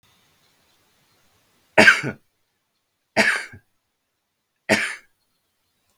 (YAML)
three_cough_length: 6.0 s
three_cough_amplitude: 32768
three_cough_signal_mean_std_ratio: 0.25
survey_phase: beta (2021-08-13 to 2022-03-07)
age: 45-64
gender: Male
wearing_mask: 'No'
symptom_none: true
smoker_status: Never smoked
respiratory_condition_asthma: false
respiratory_condition_other: false
recruitment_source: REACT
submission_delay: 1 day
covid_test_result: Negative
covid_test_method: RT-qPCR
influenza_a_test_result: Negative
influenza_b_test_result: Negative